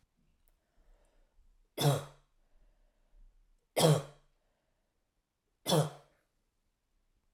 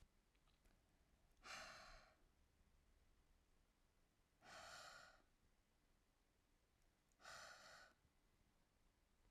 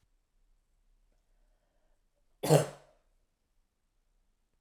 {"three_cough_length": "7.3 s", "three_cough_amplitude": 8994, "three_cough_signal_mean_std_ratio": 0.25, "exhalation_length": "9.3 s", "exhalation_amplitude": 180, "exhalation_signal_mean_std_ratio": 0.56, "cough_length": "4.6 s", "cough_amplitude": 12727, "cough_signal_mean_std_ratio": 0.17, "survey_phase": "alpha (2021-03-01 to 2021-08-12)", "age": "18-44", "gender": "Female", "wearing_mask": "No", "symptom_cough_any": true, "symptom_new_continuous_cough": true, "symptom_fatigue": true, "symptom_headache": true, "symptom_onset": "2 days", "smoker_status": "Never smoked", "respiratory_condition_asthma": false, "respiratory_condition_other": false, "recruitment_source": "Test and Trace", "submission_delay": "1 day", "covid_test_result": "Positive", "covid_test_method": "RT-qPCR"}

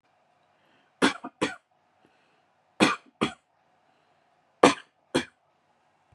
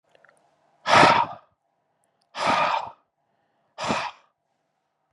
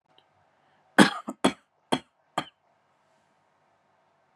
{"three_cough_length": "6.1 s", "three_cough_amplitude": 32273, "three_cough_signal_mean_std_ratio": 0.23, "exhalation_length": "5.1 s", "exhalation_amplitude": 28060, "exhalation_signal_mean_std_ratio": 0.35, "cough_length": "4.4 s", "cough_amplitude": 28368, "cough_signal_mean_std_ratio": 0.19, "survey_phase": "beta (2021-08-13 to 2022-03-07)", "age": "18-44", "gender": "Male", "wearing_mask": "No", "symptom_none": true, "smoker_status": "Never smoked", "respiratory_condition_asthma": false, "respiratory_condition_other": false, "recruitment_source": "REACT", "submission_delay": "2 days", "covid_test_result": "Negative", "covid_test_method": "RT-qPCR", "influenza_a_test_result": "Negative", "influenza_b_test_result": "Negative"}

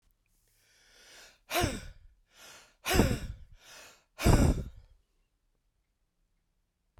{"exhalation_length": "7.0 s", "exhalation_amplitude": 10889, "exhalation_signal_mean_std_ratio": 0.32, "survey_phase": "beta (2021-08-13 to 2022-03-07)", "age": "65+", "gender": "Male", "wearing_mask": "No", "symptom_cough_any": true, "symptom_runny_or_blocked_nose": true, "symptom_shortness_of_breath": true, "symptom_sore_throat": true, "symptom_diarrhoea": true, "symptom_other": true, "symptom_onset": "8 days", "smoker_status": "Ex-smoker", "respiratory_condition_asthma": false, "respiratory_condition_other": false, "recruitment_source": "Test and Trace", "submission_delay": "2 days", "covid_test_result": "Positive", "covid_test_method": "RT-qPCR", "covid_ct_value": 18.4, "covid_ct_gene": "ORF1ab gene", "covid_ct_mean": 18.6, "covid_viral_load": "790000 copies/ml", "covid_viral_load_category": "Low viral load (10K-1M copies/ml)"}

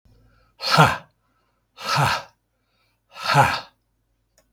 {"exhalation_length": "4.5 s", "exhalation_amplitude": 32293, "exhalation_signal_mean_std_ratio": 0.37, "survey_phase": "beta (2021-08-13 to 2022-03-07)", "age": "45-64", "gender": "Male", "wearing_mask": "No", "symptom_cough_any": true, "symptom_new_continuous_cough": true, "symptom_runny_or_blocked_nose": true, "symptom_fatigue": true, "symptom_headache": true, "symptom_change_to_sense_of_smell_or_taste": true, "smoker_status": "Never smoked", "respiratory_condition_asthma": false, "respiratory_condition_other": false, "recruitment_source": "Test and Trace", "submission_delay": "0 days", "covid_test_result": "Positive", "covid_test_method": "LFT"}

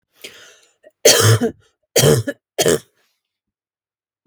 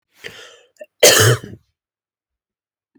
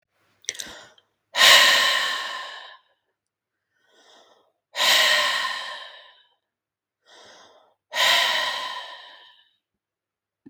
{"three_cough_length": "4.3 s", "three_cough_amplitude": 32768, "three_cough_signal_mean_std_ratio": 0.38, "cough_length": "3.0 s", "cough_amplitude": 32768, "cough_signal_mean_std_ratio": 0.3, "exhalation_length": "10.5 s", "exhalation_amplitude": 32766, "exhalation_signal_mean_std_ratio": 0.4, "survey_phase": "beta (2021-08-13 to 2022-03-07)", "age": "18-44", "gender": "Female", "wearing_mask": "No", "symptom_none": true, "symptom_onset": "6 days", "smoker_status": "Never smoked", "respiratory_condition_asthma": false, "respiratory_condition_other": false, "recruitment_source": "REACT", "submission_delay": "0 days", "covid_test_result": "Negative", "covid_test_method": "RT-qPCR", "influenza_a_test_result": "Unknown/Void", "influenza_b_test_result": "Unknown/Void"}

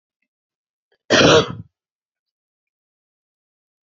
{"cough_length": "3.9 s", "cough_amplitude": 28609, "cough_signal_mean_std_ratio": 0.25, "survey_phase": "beta (2021-08-13 to 2022-03-07)", "age": "45-64", "gender": "Female", "wearing_mask": "No", "symptom_cough_any": true, "symptom_runny_or_blocked_nose": true, "symptom_fatigue": true, "symptom_headache": true, "smoker_status": "Ex-smoker", "respiratory_condition_asthma": false, "respiratory_condition_other": false, "recruitment_source": "Test and Trace", "submission_delay": "1 day", "covid_test_result": "Positive", "covid_test_method": "RT-qPCR"}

